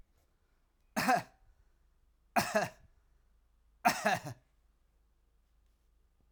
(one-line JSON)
{"three_cough_length": "6.3 s", "three_cough_amplitude": 6963, "three_cough_signal_mean_std_ratio": 0.3, "survey_phase": "alpha (2021-03-01 to 2021-08-12)", "age": "45-64", "gender": "Male", "wearing_mask": "No", "symptom_cough_any": true, "smoker_status": "Never smoked", "respiratory_condition_asthma": false, "respiratory_condition_other": false, "recruitment_source": "Test and Trace", "submission_delay": "2 days", "covid_test_result": "Positive", "covid_test_method": "RT-qPCR", "covid_ct_value": 29.4, "covid_ct_gene": "ORF1ab gene", "covid_ct_mean": 29.9, "covid_viral_load": "160 copies/ml", "covid_viral_load_category": "Minimal viral load (< 10K copies/ml)"}